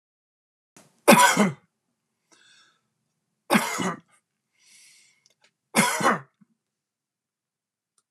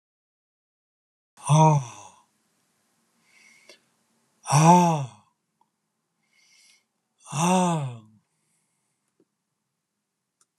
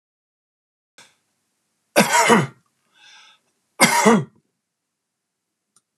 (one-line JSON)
{"three_cough_length": "8.1 s", "three_cough_amplitude": 29204, "three_cough_signal_mean_std_ratio": 0.28, "exhalation_length": "10.6 s", "exhalation_amplitude": 21330, "exhalation_signal_mean_std_ratio": 0.29, "cough_length": "6.0 s", "cough_amplitude": 32730, "cough_signal_mean_std_ratio": 0.31, "survey_phase": "alpha (2021-03-01 to 2021-08-12)", "age": "65+", "gender": "Male", "wearing_mask": "No", "symptom_none": true, "smoker_status": "Never smoked", "respiratory_condition_asthma": false, "respiratory_condition_other": false, "recruitment_source": "REACT", "submission_delay": "3 days", "covid_test_result": "Negative", "covid_test_method": "RT-qPCR"}